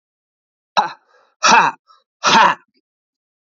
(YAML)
exhalation_length: 3.6 s
exhalation_amplitude: 30892
exhalation_signal_mean_std_ratio: 0.35
survey_phase: alpha (2021-03-01 to 2021-08-12)
age: 18-44
gender: Male
wearing_mask: 'No'
symptom_cough_any: true
symptom_diarrhoea: true
symptom_fever_high_temperature: true
symptom_headache: true
symptom_change_to_sense_of_smell_or_taste: true
symptom_onset: 4 days
smoker_status: Current smoker (1 to 10 cigarettes per day)
respiratory_condition_asthma: false
respiratory_condition_other: false
recruitment_source: Test and Trace
submission_delay: 1 day
covid_test_result: Positive
covid_test_method: RT-qPCR